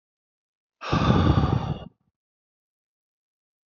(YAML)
exhalation_length: 3.7 s
exhalation_amplitude: 15736
exhalation_signal_mean_std_ratio: 0.39
survey_phase: alpha (2021-03-01 to 2021-08-12)
age: 45-64
gender: Male
wearing_mask: 'No'
symptom_abdominal_pain: true
symptom_onset: 5 days
smoker_status: Current smoker (1 to 10 cigarettes per day)
respiratory_condition_asthma: false
respiratory_condition_other: false
recruitment_source: REACT
submission_delay: 1 day
covid_test_result: Negative
covid_test_method: RT-qPCR